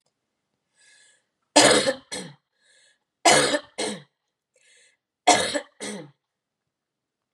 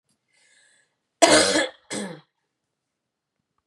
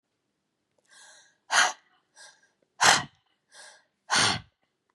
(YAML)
three_cough_length: 7.3 s
three_cough_amplitude: 26395
three_cough_signal_mean_std_ratio: 0.31
cough_length: 3.7 s
cough_amplitude: 32116
cough_signal_mean_std_ratio: 0.29
exhalation_length: 4.9 s
exhalation_amplitude: 17501
exhalation_signal_mean_std_ratio: 0.3
survey_phase: beta (2021-08-13 to 2022-03-07)
age: 45-64
gender: Female
wearing_mask: 'No'
symptom_none: true
smoker_status: Never smoked
respiratory_condition_asthma: false
respiratory_condition_other: false
recruitment_source: Test and Trace
submission_delay: 1 day
covid_test_result: Negative
covid_test_method: ePCR